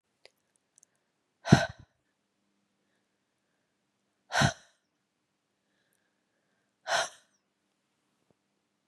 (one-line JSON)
{"exhalation_length": "8.9 s", "exhalation_amplitude": 22873, "exhalation_signal_mean_std_ratio": 0.16, "survey_phase": "beta (2021-08-13 to 2022-03-07)", "age": "45-64", "gender": "Female", "wearing_mask": "No", "symptom_none": true, "smoker_status": "Never smoked", "respiratory_condition_asthma": false, "respiratory_condition_other": false, "recruitment_source": "REACT", "submission_delay": "1 day", "covid_test_result": "Negative", "covid_test_method": "RT-qPCR", "influenza_a_test_result": "Negative", "influenza_b_test_result": "Negative"}